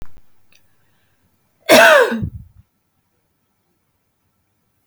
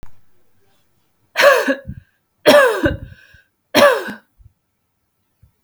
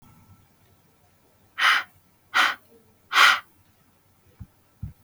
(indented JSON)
{
  "cough_length": "4.9 s",
  "cough_amplitude": 32768,
  "cough_signal_mean_std_ratio": 0.28,
  "three_cough_length": "5.6 s",
  "three_cough_amplitude": 32768,
  "three_cough_signal_mean_std_ratio": 0.37,
  "exhalation_length": "5.0 s",
  "exhalation_amplitude": 28054,
  "exhalation_signal_mean_std_ratio": 0.31,
  "survey_phase": "beta (2021-08-13 to 2022-03-07)",
  "age": "18-44",
  "gender": "Female",
  "wearing_mask": "No",
  "symptom_none": true,
  "smoker_status": "Never smoked",
  "respiratory_condition_asthma": false,
  "respiratory_condition_other": false,
  "recruitment_source": "REACT",
  "submission_delay": "2 days",
  "covid_test_result": "Negative",
  "covid_test_method": "RT-qPCR",
  "influenza_a_test_result": "Negative",
  "influenza_b_test_result": "Negative"
}